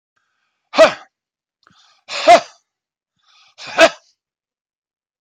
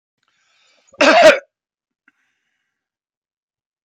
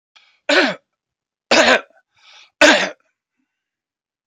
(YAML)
exhalation_length: 5.2 s
exhalation_amplitude: 32768
exhalation_signal_mean_std_ratio: 0.25
cough_length: 3.8 s
cough_amplitude: 30404
cough_signal_mean_std_ratio: 0.26
three_cough_length: 4.3 s
three_cough_amplitude: 31049
three_cough_signal_mean_std_ratio: 0.34
survey_phase: beta (2021-08-13 to 2022-03-07)
age: 65+
gender: Male
wearing_mask: 'No'
symptom_none: true
smoker_status: Never smoked
respiratory_condition_asthma: true
respiratory_condition_other: false
recruitment_source: REACT
submission_delay: 0 days
covid_test_result: Negative
covid_test_method: RT-qPCR